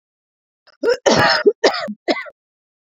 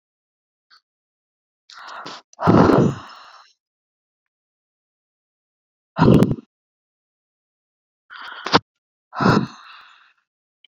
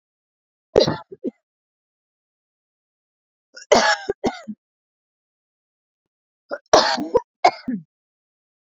{
  "cough_length": "2.8 s",
  "cough_amplitude": 30955,
  "cough_signal_mean_std_ratio": 0.46,
  "exhalation_length": "10.8 s",
  "exhalation_amplitude": 32767,
  "exhalation_signal_mean_std_ratio": 0.28,
  "three_cough_length": "8.6 s",
  "three_cough_amplitude": 32767,
  "three_cough_signal_mean_std_ratio": 0.27,
  "survey_phase": "beta (2021-08-13 to 2022-03-07)",
  "age": "18-44",
  "gender": "Female",
  "wearing_mask": "No",
  "symptom_fatigue": true,
  "symptom_onset": "12 days",
  "smoker_status": "Ex-smoker",
  "respiratory_condition_asthma": false,
  "respiratory_condition_other": false,
  "recruitment_source": "REACT",
  "submission_delay": "1 day",
  "covid_test_result": "Negative",
  "covid_test_method": "RT-qPCR"
}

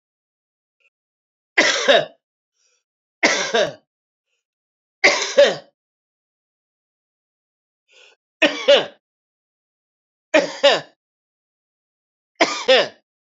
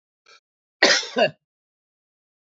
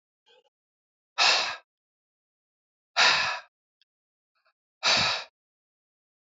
{
  "three_cough_length": "13.4 s",
  "three_cough_amplitude": 29572,
  "three_cough_signal_mean_std_ratio": 0.31,
  "cough_length": "2.6 s",
  "cough_amplitude": 32767,
  "cough_signal_mean_std_ratio": 0.28,
  "exhalation_length": "6.2 s",
  "exhalation_amplitude": 13382,
  "exhalation_signal_mean_std_ratio": 0.33,
  "survey_phase": "beta (2021-08-13 to 2022-03-07)",
  "age": "65+",
  "gender": "Male",
  "wearing_mask": "No",
  "symptom_cough_any": true,
  "symptom_runny_or_blocked_nose": true,
  "smoker_status": "Ex-smoker",
  "respiratory_condition_asthma": false,
  "respiratory_condition_other": false,
  "recruitment_source": "REACT",
  "submission_delay": "2 days",
  "covid_test_result": "Negative",
  "covid_test_method": "RT-qPCR",
  "influenza_a_test_result": "Unknown/Void",
  "influenza_b_test_result": "Unknown/Void"
}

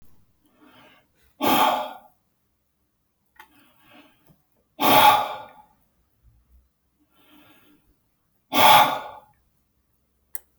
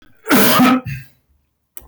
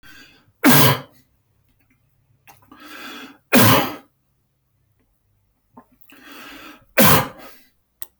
{
  "exhalation_length": "10.6 s",
  "exhalation_amplitude": 20554,
  "exhalation_signal_mean_std_ratio": 0.3,
  "cough_length": "1.9 s",
  "cough_amplitude": 25655,
  "cough_signal_mean_std_ratio": 0.54,
  "three_cough_length": "8.2 s",
  "three_cough_amplitude": 28468,
  "three_cough_signal_mean_std_ratio": 0.32,
  "survey_phase": "alpha (2021-03-01 to 2021-08-12)",
  "age": "45-64",
  "gender": "Male",
  "wearing_mask": "No",
  "symptom_none": true,
  "smoker_status": "Never smoked",
  "respiratory_condition_asthma": false,
  "respiratory_condition_other": false,
  "recruitment_source": "REACT",
  "submission_delay": "1 day",
  "covid_test_result": "Negative",
  "covid_test_method": "RT-qPCR"
}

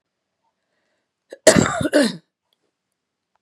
{
  "cough_length": "3.4 s",
  "cough_amplitude": 32768,
  "cough_signal_mean_std_ratio": 0.29,
  "survey_phase": "beta (2021-08-13 to 2022-03-07)",
  "age": "18-44",
  "gender": "Female",
  "wearing_mask": "No",
  "symptom_cough_any": true,
  "symptom_runny_or_blocked_nose": true,
  "symptom_sore_throat": true,
  "symptom_onset": "11 days",
  "smoker_status": "Never smoked",
  "respiratory_condition_asthma": false,
  "respiratory_condition_other": false,
  "recruitment_source": "REACT",
  "submission_delay": "4 days",
  "covid_test_result": "Negative",
  "covid_test_method": "RT-qPCR",
  "influenza_a_test_result": "Negative",
  "influenza_b_test_result": "Negative"
}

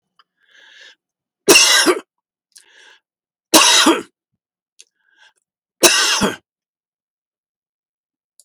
{
  "three_cough_length": "8.4 s",
  "three_cough_amplitude": 32768,
  "three_cough_signal_mean_std_ratio": 0.33,
  "survey_phase": "beta (2021-08-13 to 2022-03-07)",
  "age": "65+",
  "gender": "Male",
  "wearing_mask": "No",
  "symptom_fatigue": true,
  "symptom_headache": true,
  "smoker_status": "Never smoked",
  "respiratory_condition_asthma": false,
  "respiratory_condition_other": false,
  "recruitment_source": "REACT",
  "submission_delay": "1 day",
  "covid_test_result": "Negative",
  "covid_test_method": "RT-qPCR"
}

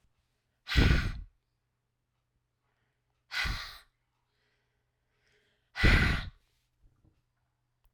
{
  "exhalation_length": "7.9 s",
  "exhalation_amplitude": 9421,
  "exhalation_signal_mean_std_ratio": 0.29,
  "survey_phase": "alpha (2021-03-01 to 2021-08-12)",
  "age": "45-64",
  "gender": "Female",
  "wearing_mask": "No",
  "symptom_cough_any": true,
  "symptom_fatigue": true,
  "symptom_fever_high_temperature": true,
  "symptom_onset": "3 days",
  "smoker_status": "Never smoked",
  "respiratory_condition_asthma": false,
  "respiratory_condition_other": false,
  "recruitment_source": "Test and Trace",
  "submission_delay": "1 day",
  "covid_test_result": "Positive",
  "covid_test_method": "RT-qPCR"
}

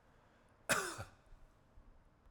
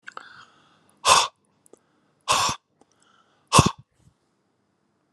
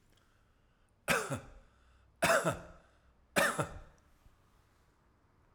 {
  "cough_length": "2.3 s",
  "cough_amplitude": 3650,
  "cough_signal_mean_std_ratio": 0.34,
  "exhalation_length": "5.1 s",
  "exhalation_amplitude": 32019,
  "exhalation_signal_mean_std_ratio": 0.27,
  "three_cough_length": "5.5 s",
  "three_cough_amplitude": 7145,
  "three_cough_signal_mean_std_ratio": 0.34,
  "survey_phase": "alpha (2021-03-01 to 2021-08-12)",
  "age": "45-64",
  "gender": "Male",
  "wearing_mask": "No",
  "symptom_none": true,
  "smoker_status": "Ex-smoker",
  "respiratory_condition_asthma": true,
  "respiratory_condition_other": false,
  "recruitment_source": "REACT",
  "submission_delay": "1 day",
  "covid_test_result": "Negative",
  "covid_test_method": "RT-qPCR"
}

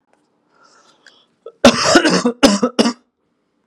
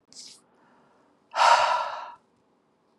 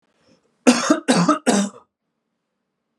{
  "cough_length": "3.7 s",
  "cough_amplitude": 32768,
  "cough_signal_mean_std_ratio": 0.4,
  "exhalation_length": "3.0 s",
  "exhalation_amplitude": 16901,
  "exhalation_signal_mean_std_ratio": 0.36,
  "three_cough_length": "3.0 s",
  "three_cough_amplitude": 32724,
  "three_cough_signal_mean_std_ratio": 0.41,
  "survey_phase": "alpha (2021-03-01 to 2021-08-12)",
  "age": "18-44",
  "gender": "Male",
  "wearing_mask": "No",
  "symptom_none": true,
  "smoker_status": "Never smoked",
  "respiratory_condition_asthma": false,
  "respiratory_condition_other": false,
  "recruitment_source": "Test and Trace",
  "submission_delay": "1 day",
  "covid_test_result": "Positive",
  "covid_test_method": "LFT"
}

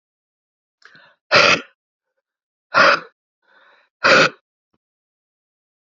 {
  "exhalation_length": "5.8 s",
  "exhalation_amplitude": 32017,
  "exhalation_signal_mean_std_ratio": 0.29,
  "survey_phase": "alpha (2021-03-01 to 2021-08-12)",
  "age": "45-64",
  "gender": "Female",
  "wearing_mask": "No",
  "symptom_cough_any": true,
  "symptom_shortness_of_breath": true,
  "symptom_fatigue": true,
  "symptom_headache": true,
  "smoker_status": "Ex-smoker",
  "respiratory_condition_asthma": true,
  "respiratory_condition_other": false,
  "recruitment_source": "Test and Trace",
  "submission_delay": "1 day",
  "covid_test_result": "Positive",
  "covid_test_method": "RT-qPCR",
  "covid_ct_value": 23.6,
  "covid_ct_gene": "ORF1ab gene",
  "covid_ct_mean": 26.2,
  "covid_viral_load": "2600 copies/ml",
  "covid_viral_load_category": "Minimal viral load (< 10K copies/ml)"
}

